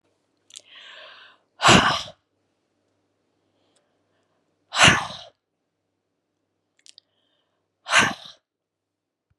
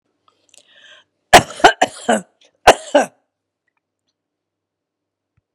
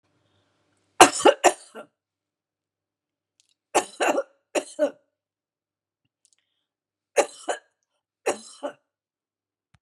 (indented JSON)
{
  "exhalation_length": "9.4 s",
  "exhalation_amplitude": 31053,
  "exhalation_signal_mean_std_ratio": 0.24,
  "cough_length": "5.5 s",
  "cough_amplitude": 32768,
  "cough_signal_mean_std_ratio": 0.23,
  "three_cough_length": "9.8 s",
  "three_cough_amplitude": 32768,
  "three_cough_signal_mean_std_ratio": 0.22,
  "survey_phase": "beta (2021-08-13 to 2022-03-07)",
  "age": "65+",
  "gender": "Female",
  "wearing_mask": "No",
  "symptom_cough_any": true,
  "symptom_abdominal_pain": true,
  "symptom_diarrhoea": true,
  "symptom_fatigue": true,
  "symptom_onset": "13 days",
  "smoker_status": "Never smoked",
  "respiratory_condition_asthma": false,
  "respiratory_condition_other": false,
  "recruitment_source": "REACT",
  "submission_delay": "1 day",
  "covid_test_result": "Negative",
  "covid_test_method": "RT-qPCR"
}